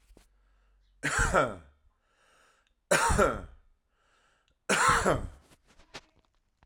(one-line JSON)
{"three_cough_length": "6.7 s", "three_cough_amplitude": 9672, "three_cough_signal_mean_std_ratio": 0.4, "survey_phase": "alpha (2021-03-01 to 2021-08-12)", "age": "18-44", "gender": "Male", "wearing_mask": "No", "symptom_fatigue": true, "symptom_headache": true, "smoker_status": "Current smoker (e-cigarettes or vapes only)", "respiratory_condition_asthma": false, "respiratory_condition_other": false, "recruitment_source": "Test and Trace", "submission_delay": "1 day", "covid_test_result": "Positive", "covid_test_method": "RT-qPCR", "covid_ct_value": 20.1, "covid_ct_gene": "ORF1ab gene", "covid_ct_mean": 21.1, "covid_viral_load": "120000 copies/ml", "covid_viral_load_category": "Low viral load (10K-1M copies/ml)"}